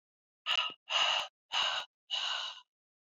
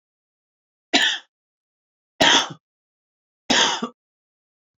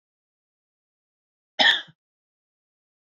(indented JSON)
{
  "exhalation_length": "3.2 s",
  "exhalation_amplitude": 4227,
  "exhalation_signal_mean_std_ratio": 0.55,
  "three_cough_length": "4.8 s",
  "three_cough_amplitude": 26014,
  "three_cough_signal_mean_std_ratio": 0.32,
  "cough_length": "3.2 s",
  "cough_amplitude": 17832,
  "cough_signal_mean_std_ratio": 0.19,
  "survey_phase": "beta (2021-08-13 to 2022-03-07)",
  "age": "18-44",
  "gender": "Female",
  "wearing_mask": "No",
  "symptom_runny_or_blocked_nose": true,
  "symptom_fatigue": true,
  "smoker_status": "Never smoked",
  "respiratory_condition_asthma": true,
  "respiratory_condition_other": false,
  "recruitment_source": "Test and Trace",
  "submission_delay": "2 days",
  "covid_test_result": "Positive",
  "covid_test_method": "RT-qPCR"
}